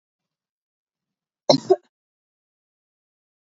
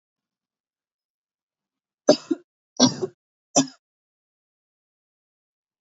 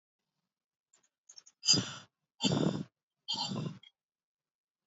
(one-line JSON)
{"cough_length": "3.5 s", "cough_amplitude": 27525, "cough_signal_mean_std_ratio": 0.15, "three_cough_length": "5.8 s", "three_cough_amplitude": 25311, "three_cough_signal_mean_std_ratio": 0.19, "exhalation_length": "4.9 s", "exhalation_amplitude": 7644, "exhalation_signal_mean_std_ratio": 0.35, "survey_phase": "beta (2021-08-13 to 2022-03-07)", "age": "18-44", "gender": "Female", "wearing_mask": "No", "symptom_none": true, "smoker_status": "Never smoked", "respiratory_condition_asthma": false, "respiratory_condition_other": false, "recruitment_source": "REACT", "submission_delay": "1 day", "covid_test_result": "Negative", "covid_test_method": "RT-qPCR", "influenza_a_test_result": "Unknown/Void", "influenza_b_test_result": "Unknown/Void"}